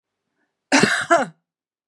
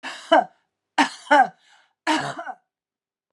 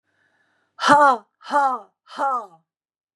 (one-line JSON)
{"cough_length": "1.9 s", "cough_amplitude": 28932, "cough_signal_mean_std_ratio": 0.39, "three_cough_length": "3.3 s", "three_cough_amplitude": 25105, "three_cough_signal_mean_std_ratio": 0.36, "exhalation_length": "3.2 s", "exhalation_amplitude": 31667, "exhalation_signal_mean_std_ratio": 0.4, "survey_phase": "beta (2021-08-13 to 2022-03-07)", "age": "45-64", "gender": "Female", "wearing_mask": "No", "symptom_sore_throat": true, "symptom_onset": "2 days", "smoker_status": "Ex-smoker", "respiratory_condition_asthma": false, "respiratory_condition_other": false, "recruitment_source": "Test and Trace", "submission_delay": "1 day", "covid_test_result": "Positive", "covid_test_method": "ePCR"}